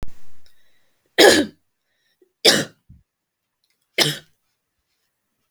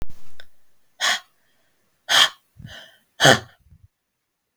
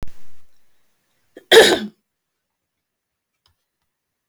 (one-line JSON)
{"three_cough_length": "5.5 s", "three_cough_amplitude": 32768, "three_cough_signal_mean_std_ratio": 0.3, "exhalation_length": "4.6 s", "exhalation_amplitude": 32768, "exhalation_signal_mean_std_ratio": 0.37, "cough_length": "4.3 s", "cough_amplitude": 32768, "cough_signal_mean_std_ratio": 0.27, "survey_phase": "beta (2021-08-13 to 2022-03-07)", "age": "18-44", "gender": "Female", "wearing_mask": "No", "symptom_cough_any": true, "symptom_runny_or_blocked_nose": true, "symptom_fatigue": true, "symptom_onset": "3 days", "smoker_status": "Never smoked", "respiratory_condition_asthma": true, "respiratory_condition_other": false, "recruitment_source": "Test and Trace", "submission_delay": "2 days", "covid_test_result": "Positive", "covid_test_method": "RT-qPCR", "covid_ct_value": 32.7, "covid_ct_gene": "ORF1ab gene"}